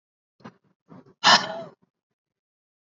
exhalation_length: 2.8 s
exhalation_amplitude: 24648
exhalation_signal_mean_std_ratio: 0.23
survey_phase: alpha (2021-03-01 to 2021-08-12)
age: 18-44
gender: Female
wearing_mask: 'No'
symptom_none: true
smoker_status: Never smoked
respiratory_condition_asthma: false
respiratory_condition_other: false
recruitment_source: REACT
submission_delay: 2 days
covid_test_result: Negative
covid_test_method: RT-qPCR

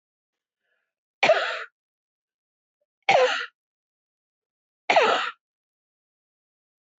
three_cough_length: 7.0 s
three_cough_amplitude: 19768
three_cough_signal_mean_std_ratio: 0.3
survey_phase: beta (2021-08-13 to 2022-03-07)
age: 45-64
gender: Female
wearing_mask: 'No'
symptom_cough_any: true
symptom_runny_or_blocked_nose: true
smoker_status: Ex-smoker
respiratory_condition_asthma: false
respiratory_condition_other: false
recruitment_source: REACT
submission_delay: 3 days
covid_test_result: Negative
covid_test_method: RT-qPCR
influenza_a_test_result: Negative
influenza_b_test_result: Negative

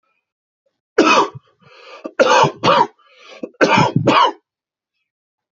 three_cough_length: 5.5 s
three_cough_amplitude: 30872
three_cough_signal_mean_std_ratio: 0.44
survey_phase: beta (2021-08-13 to 2022-03-07)
age: 18-44
gender: Male
wearing_mask: 'No'
symptom_none: true
symptom_onset: 3 days
smoker_status: Never smoked
respiratory_condition_asthma: false
respiratory_condition_other: false
recruitment_source: Test and Trace
submission_delay: 2 days
covid_test_result: Positive
covid_test_method: RT-qPCR
covid_ct_value: 23.6
covid_ct_gene: ORF1ab gene
covid_ct_mean: 23.9
covid_viral_load: 14000 copies/ml
covid_viral_load_category: Low viral load (10K-1M copies/ml)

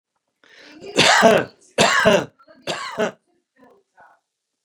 three_cough_length: 4.6 s
three_cough_amplitude: 30769
three_cough_signal_mean_std_ratio: 0.4
survey_phase: beta (2021-08-13 to 2022-03-07)
age: 65+
gender: Male
wearing_mask: 'No'
symptom_runny_or_blocked_nose: true
symptom_sore_throat: true
smoker_status: Ex-smoker
respiratory_condition_asthma: false
respiratory_condition_other: false
recruitment_source: REACT
submission_delay: 1 day
covid_test_result: Negative
covid_test_method: RT-qPCR
influenza_a_test_result: Negative
influenza_b_test_result: Negative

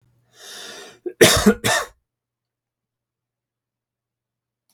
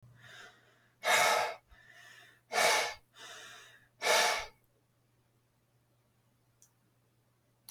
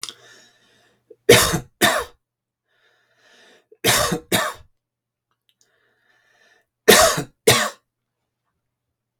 cough_length: 4.7 s
cough_amplitude: 32768
cough_signal_mean_std_ratio: 0.26
exhalation_length: 7.7 s
exhalation_amplitude: 6799
exhalation_signal_mean_std_ratio: 0.36
three_cough_length: 9.2 s
three_cough_amplitude: 32768
three_cough_signal_mean_std_ratio: 0.31
survey_phase: beta (2021-08-13 to 2022-03-07)
age: 45-64
gender: Male
wearing_mask: 'No'
symptom_none: true
smoker_status: Ex-smoker
respiratory_condition_asthma: false
respiratory_condition_other: false
recruitment_source: REACT
submission_delay: 1 day
covid_test_result: Negative
covid_test_method: RT-qPCR
influenza_a_test_result: Unknown/Void
influenza_b_test_result: Unknown/Void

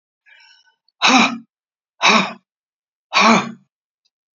exhalation_length: 4.4 s
exhalation_amplitude: 32768
exhalation_signal_mean_std_ratio: 0.37
survey_phase: beta (2021-08-13 to 2022-03-07)
age: 65+
gender: Female
wearing_mask: 'No'
symptom_none: true
smoker_status: Ex-smoker
respiratory_condition_asthma: false
respiratory_condition_other: false
recruitment_source: REACT
submission_delay: 1 day
covid_test_result: Negative
covid_test_method: RT-qPCR
influenza_a_test_result: Negative
influenza_b_test_result: Negative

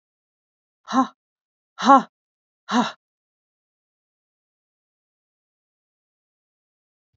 exhalation_length: 7.2 s
exhalation_amplitude: 28144
exhalation_signal_mean_std_ratio: 0.18
survey_phase: alpha (2021-03-01 to 2021-08-12)
age: 65+
gender: Female
wearing_mask: 'No'
symptom_none: true
smoker_status: Never smoked
respiratory_condition_asthma: false
respiratory_condition_other: false
recruitment_source: REACT
submission_delay: 2 days
covid_test_result: Negative
covid_test_method: RT-qPCR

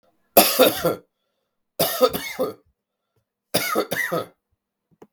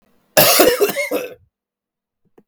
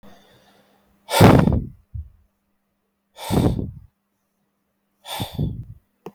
three_cough_length: 5.1 s
three_cough_amplitude: 32768
three_cough_signal_mean_std_ratio: 0.4
cough_length: 2.5 s
cough_amplitude: 32768
cough_signal_mean_std_ratio: 0.45
exhalation_length: 6.1 s
exhalation_amplitude: 32768
exhalation_signal_mean_std_ratio: 0.32
survey_phase: beta (2021-08-13 to 2022-03-07)
age: 18-44
gender: Male
wearing_mask: 'No'
symptom_none: true
symptom_onset: 13 days
smoker_status: Never smoked
respiratory_condition_asthma: false
respiratory_condition_other: false
recruitment_source: REACT
submission_delay: 1 day
covid_test_result: Negative
covid_test_method: RT-qPCR
influenza_a_test_result: Unknown/Void
influenza_b_test_result: Unknown/Void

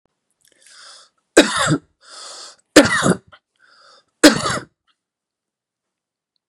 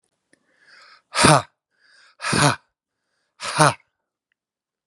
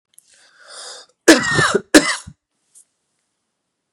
three_cough_length: 6.5 s
three_cough_amplitude: 32768
three_cough_signal_mean_std_ratio: 0.28
exhalation_length: 4.9 s
exhalation_amplitude: 32767
exhalation_signal_mean_std_ratio: 0.29
cough_length: 3.9 s
cough_amplitude: 32768
cough_signal_mean_std_ratio: 0.3
survey_phase: beta (2021-08-13 to 2022-03-07)
age: 45-64
gender: Male
wearing_mask: 'No'
symptom_cough_any: true
symptom_new_continuous_cough: true
symptom_runny_or_blocked_nose: true
symptom_shortness_of_breath: true
symptom_fatigue: true
symptom_headache: true
smoker_status: Ex-smoker
respiratory_condition_asthma: true
respiratory_condition_other: false
recruitment_source: Test and Trace
submission_delay: 2 days
covid_test_result: Positive
covid_test_method: ePCR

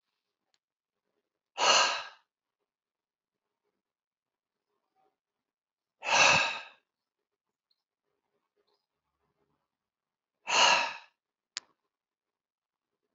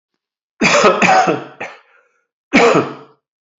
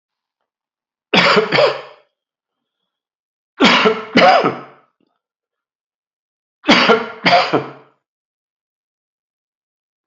exhalation_length: 13.1 s
exhalation_amplitude: 11730
exhalation_signal_mean_std_ratio: 0.25
cough_length: 3.6 s
cough_amplitude: 29634
cough_signal_mean_std_ratio: 0.49
three_cough_length: 10.1 s
three_cough_amplitude: 32239
three_cough_signal_mean_std_ratio: 0.37
survey_phase: alpha (2021-03-01 to 2021-08-12)
age: 65+
gender: Male
wearing_mask: 'No'
symptom_cough_any: true
symptom_fatigue: true
symptom_headache: true
symptom_onset: 4 days
smoker_status: Never smoked
respiratory_condition_asthma: false
respiratory_condition_other: false
recruitment_source: Test and Trace
submission_delay: 2 days
covid_test_result: Positive
covid_test_method: RT-qPCR
covid_ct_value: 15.4
covid_ct_gene: ORF1ab gene
covid_ct_mean: 15.9
covid_viral_load: 6300000 copies/ml
covid_viral_load_category: High viral load (>1M copies/ml)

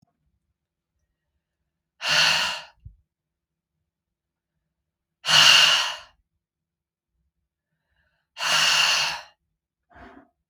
exhalation_length: 10.5 s
exhalation_amplitude: 32273
exhalation_signal_mean_std_ratio: 0.34
survey_phase: beta (2021-08-13 to 2022-03-07)
age: 18-44
gender: Female
wearing_mask: 'No'
symptom_cough_any: true
symptom_runny_or_blocked_nose: true
symptom_sore_throat: true
symptom_diarrhoea: true
symptom_fatigue: true
symptom_headache: true
symptom_onset: 1 day
smoker_status: Ex-smoker
respiratory_condition_asthma: false
respiratory_condition_other: false
recruitment_source: Test and Trace
submission_delay: 1 day
covid_test_result: Positive
covid_test_method: RT-qPCR
covid_ct_value: 21.4
covid_ct_gene: N gene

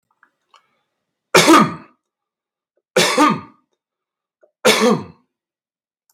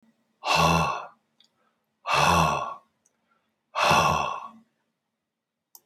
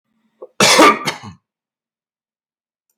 three_cough_length: 6.1 s
three_cough_amplitude: 32768
three_cough_signal_mean_std_ratio: 0.34
exhalation_length: 5.9 s
exhalation_amplitude: 16368
exhalation_signal_mean_std_ratio: 0.46
cough_length: 3.0 s
cough_amplitude: 32768
cough_signal_mean_std_ratio: 0.32
survey_phase: beta (2021-08-13 to 2022-03-07)
age: 65+
gender: Male
wearing_mask: 'No'
symptom_none: true
smoker_status: Ex-smoker
respiratory_condition_asthma: false
respiratory_condition_other: false
recruitment_source: REACT
submission_delay: 1 day
covid_test_result: Negative
covid_test_method: RT-qPCR
influenza_a_test_result: Negative
influenza_b_test_result: Negative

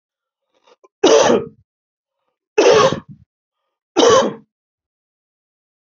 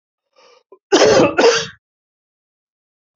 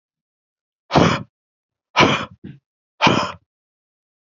three_cough_length: 5.8 s
three_cough_amplitude: 32380
three_cough_signal_mean_std_ratio: 0.37
cough_length: 3.2 s
cough_amplitude: 31409
cough_signal_mean_std_ratio: 0.38
exhalation_length: 4.4 s
exhalation_amplitude: 29190
exhalation_signal_mean_std_ratio: 0.33
survey_phase: beta (2021-08-13 to 2022-03-07)
age: 45-64
gender: Male
wearing_mask: 'No'
symptom_shortness_of_breath: true
symptom_change_to_sense_of_smell_or_taste: true
symptom_loss_of_taste: true
symptom_onset: 12 days
smoker_status: Ex-smoker
respiratory_condition_asthma: false
respiratory_condition_other: false
recruitment_source: REACT
submission_delay: 1 day
covid_test_result: Negative
covid_test_method: RT-qPCR
influenza_a_test_result: Unknown/Void
influenza_b_test_result: Unknown/Void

